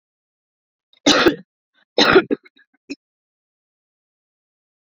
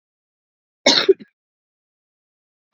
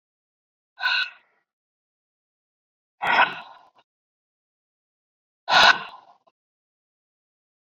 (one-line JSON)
{"three_cough_length": "4.9 s", "three_cough_amplitude": 32767, "three_cough_signal_mean_std_ratio": 0.26, "cough_length": "2.7 s", "cough_amplitude": 31390, "cough_signal_mean_std_ratio": 0.22, "exhalation_length": "7.7 s", "exhalation_amplitude": 24971, "exhalation_signal_mean_std_ratio": 0.25, "survey_phase": "beta (2021-08-13 to 2022-03-07)", "age": "18-44", "gender": "Female", "wearing_mask": "No", "symptom_cough_any": true, "symptom_runny_or_blocked_nose": true, "symptom_sore_throat": true, "symptom_fever_high_temperature": true, "symptom_headache": true, "symptom_onset": "4 days", "smoker_status": "Ex-smoker", "respiratory_condition_asthma": false, "respiratory_condition_other": false, "recruitment_source": "Test and Trace", "submission_delay": "1 day", "covid_test_result": "Positive", "covid_test_method": "RT-qPCR"}